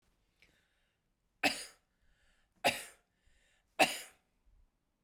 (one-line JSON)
{"three_cough_length": "5.0 s", "three_cough_amplitude": 8728, "three_cough_signal_mean_std_ratio": 0.22, "survey_phase": "beta (2021-08-13 to 2022-03-07)", "age": "45-64", "gender": "Female", "wearing_mask": "No", "symptom_cough_any": true, "symptom_runny_or_blocked_nose": true, "symptom_sore_throat": true, "symptom_fever_high_temperature": true, "symptom_headache": true, "symptom_change_to_sense_of_smell_or_taste": true, "symptom_loss_of_taste": true, "symptom_onset": "5 days", "smoker_status": "Ex-smoker", "respiratory_condition_asthma": false, "respiratory_condition_other": false, "recruitment_source": "Test and Trace", "submission_delay": "2 days", "covid_test_result": "Positive", "covid_test_method": "RT-qPCR"}